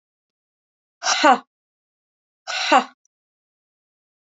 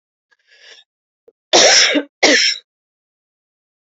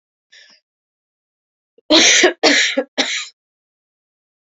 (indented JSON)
{
  "exhalation_length": "4.3 s",
  "exhalation_amplitude": 28227,
  "exhalation_signal_mean_std_ratio": 0.27,
  "cough_length": "3.9 s",
  "cough_amplitude": 32066,
  "cough_signal_mean_std_ratio": 0.38,
  "three_cough_length": "4.4 s",
  "three_cough_amplitude": 32768,
  "three_cough_signal_mean_std_ratio": 0.38,
  "survey_phase": "beta (2021-08-13 to 2022-03-07)",
  "age": "18-44",
  "gender": "Female",
  "wearing_mask": "No",
  "symptom_cough_any": true,
  "symptom_sore_throat": true,
  "symptom_fatigue": true,
  "symptom_headache": true,
  "symptom_onset": "3 days",
  "smoker_status": "Ex-smoker",
  "respiratory_condition_asthma": true,
  "respiratory_condition_other": false,
  "recruitment_source": "Test and Trace",
  "submission_delay": "1 day",
  "covid_test_result": "Positive",
  "covid_test_method": "RT-qPCR",
  "covid_ct_value": 25.6,
  "covid_ct_gene": "ORF1ab gene"
}